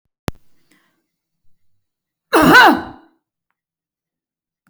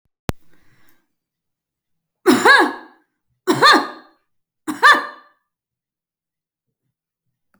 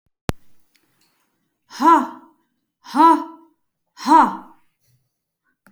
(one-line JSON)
{"cough_length": "4.7 s", "cough_amplitude": 32689, "cough_signal_mean_std_ratio": 0.27, "three_cough_length": "7.6 s", "three_cough_amplitude": 31445, "three_cough_signal_mean_std_ratio": 0.29, "exhalation_length": "5.7 s", "exhalation_amplitude": 30737, "exhalation_signal_mean_std_ratio": 0.31, "survey_phase": "beta (2021-08-13 to 2022-03-07)", "age": "45-64", "gender": "Female", "wearing_mask": "No", "symptom_none": true, "symptom_onset": "12 days", "smoker_status": "Never smoked", "respiratory_condition_asthma": false, "respiratory_condition_other": false, "recruitment_source": "REACT", "submission_delay": "2 days", "covid_test_result": "Negative", "covid_test_method": "RT-qPCR"}